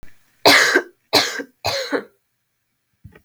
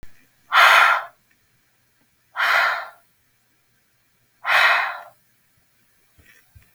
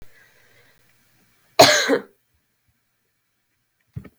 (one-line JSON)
{"three_cough_length": "3.2 s", "three_cough_amplitude": 32768, "three_cough_signal_mean_std_ratio": 0.4, "exhalation_length": "6.7 s", "exhalation_amplitude": 32076, "exhalation_signal_mean_std_ratio": 0.37, "cough_length": "4.2 s", "cough_amplitude": 32768, "cough_signal_mean_std_ratio": 0.23, "survey_phase": "beta (2021-08-13 to 2022-03-07)", "age": "18-44", "gender": "Female", "wearing_mask": "No", "symptom_sore_throat": true, "symptom_fatigue": true, "smoker_status": "Never smoked", "respiratory_condition_asthma": false, "respiratory_condition_other": false, "recruitment_source": "REACT", "submission_delay": "3 days", "covid_test_result": "Negative", "covid_test_method": "RT-qPCR"}